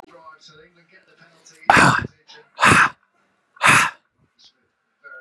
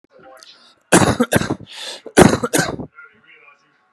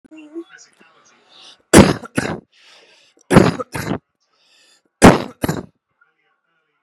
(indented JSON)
{
  "exhalation_length": "5.2 s",
  "exhalation_amplitude": 32768,
  "exhalation_signal_mean_std_ratio": 0.34,
  "cough_length": "3.9 s",
  "cough_amplitude": 32768,
  "cough_signal_mean_std_ratio": 0.37,
  "three_cough_length": "6.8 s",
  "three_cough_amplitude": 32768,
  "three_cough_signal_mean_std_ratio": 0.28,
  "survey_phase": "beta (2021-08-13 to 2022-03-07)",
  "age": "18-44",
  "gender": "Male",
  "wearing_mask": "No",
  "symptom_none": true,
  "smoker_status": "Ex-smoker",
  "respiratory_condition_asthma": false,
  "respiratory_condition_other": false,
  "recruitment_source": "REACT",
  "submission_delay": "1 day",
  "covid_test_result": "Negative",
  "covid_test_method": "RT-qPCR",
  "influenza_a_test_result": "Negative",
  "influenza_b_test_result": "Negative"
}